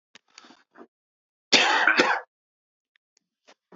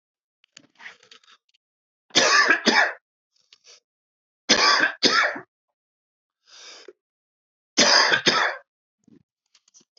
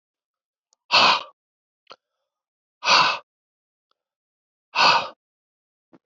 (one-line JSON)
{"cough_length": "3.8 s", "cough_amplitude": 23795, "cough_signal_mean_std_ratio": 0.33, "three_cough_length": "10.0 s", "three_cough_amplitude": 26905, "three_cough_signal_mean_std_ratio": 0.38, "exhalation_length": "6.1 s", "exhalation_amplitude": 22236, "exhalation_signal_mean_std_ratio": 0.3, "survey_phase": "beta (2021-08-13 to 2022-03-07)", "age": "18-44", "gender": "Male", "wearing_mask": "No", "symptom_cough_any": true, "symptom_fatigue": true, "symptom_fever_high_temperature": true, "symptom_headache": true, "smoker_status": "Never smoked", "respiratory_condition_asthma": true, "respiratory_condition_other": false, "recruitment_source": "Test and Trace", "submission_delay": "2 days", "covid_test_result": "Positive", "covid_test_method": "RT-qPCR", "covid_ct_value": 16.6, "covid_ct_gene": "ORF1ab gene", "covid_ct_mean": 17.8, "covid_viral_load": "1400000 copies/ml", "covid_viral_load_category": "High viral load (>1M copies/ml)"}